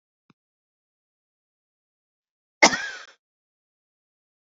{"cough_length": "4.5 s", "cough_amplitude": 29604, "cough_signal_mean_std_ratio": 0.14, "survey_phase": "beta (2021-08-13 to 2022-03-07)", "age": "45-64", "gender": "Female", "wearing_mask": "No", "symptom_cough_any": true, "symptom_runny_or_blocked_nose": true, "symptom_shortness_of_breath": true, "symptom_sore_throat": true, "symptom_headache": true, "smoker_status": "Ex-smoker", "respiratory_condition_asthma": false, "respiratory_condition_other": true, "recruitment_source": "Test and Trace", "submission_delay": "2 days", "covid_test_result": "Positive", "covid_test_method": "RT-qPCR", "covid_ct_value": 27.1, "covid_ct_gene": "ORF1ab gene", "covid_ct_mean": 27.9, "covid_viral_load": "720 copies/ml", "covid_viral_load_category": "Minimal viral load (< 10K copies/ml)"}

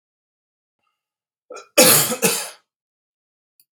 {"cough_length": "3.7 s", "cough_amplitude": 32768, "cough_signal_mean_std_ratio": 0.3, "survey_phase": "beta (2021-08-13 to 2022-03-07)", "age": "45-64", "gender": "Male", "wearing_mask": "No", "symptom_none": true, "smoker_status": "Never smoked", "respiratory_condition_asthma": false, "respiratory_condition_other": false, "recruitment_source": "REACT", "submission_delay": "3 days", "covid_test_result": "Negative", "covid_test_method": "RT-qPCR", "influenza_a_test_result": "Negative", "influenza_b_test_result": "Negative"}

